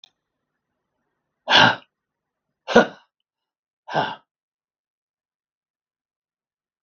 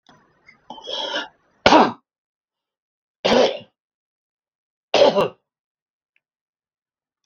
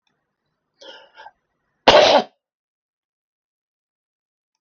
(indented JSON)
{
  "exhalation_length": "6.8 s",
  "exhalation_amplitude": 32768,
  "exhalation_signal_mean_std_ratio": 0.21,
  "three_cough_length": "7.3 s",
  "three_cough_amplitude": 32768,
  "three_cough_signal_mean_std_ratio": 0.29,
  "cough_length": "4.6 s",
  "cough_amplitude": 32768,
  "cough_signal_mean_std_ratio": 0.22,
  "survey_phase": "beta (2021-08-13 to 2022-03-07)",
  "age": "65+",
  "gender": "Male",
  "wearing_mask": "No",
  "symptom_none": true,
  "smoker_status": "Never smoked",
  "respiratory_condition_asthma": false,
  "respiratory_condition_other": false,
  "recruitment_source": "REACT",
  "submission_delay": "2 days",
  "covid_test_result": "Negative",
  "covid_test_method": "RT-qPCR"
}